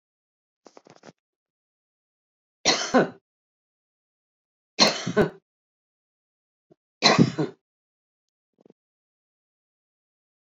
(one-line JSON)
{"three_cough_length": "10.4 s", "three_cough_amplitude": 24674, "three_cough_signal_mean_std_ratio": 0.24, "survey_phase": "beta (2021-08-13 to 2022-03-07)", "age": "65+", "gender": "Female", "wearing_mask": "No", "symptom_none": true, "smoker_status": "Ex-smoker", "respiratory_condition_asthma": false, "respiratory_condition_other": false, "recruitment_source": "REACT", "submission_delay": "1 day", "covid_test_result": "Negative", "covid_test_method": "RT-qPCR"}